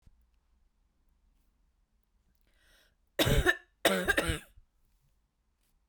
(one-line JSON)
{"three_cough_length": "5.9 s", "three_cough_amplitude": 10542, "three_cough_signal_mean_std_ratio": 0.29, "survey_phase": "beta (2021-08-13 to 2022-03-07)", "age": "18-44", "gender": "Female", "wearing_mask": "No", "symptom_cough_any": true, "symptom_runny_or_blocked_nose": true, "symptom_fatigue": true, "symptom_headache": true, "smoker_status": "Never smoked", "respiratory_condition_asthma": false, "respiratory_condition_other": false, "recruitment_source": "Test and Trace", "submission_delay": "2 days", "covid_test_result": "Positive", "covid_test_method": "RT-qPCR"}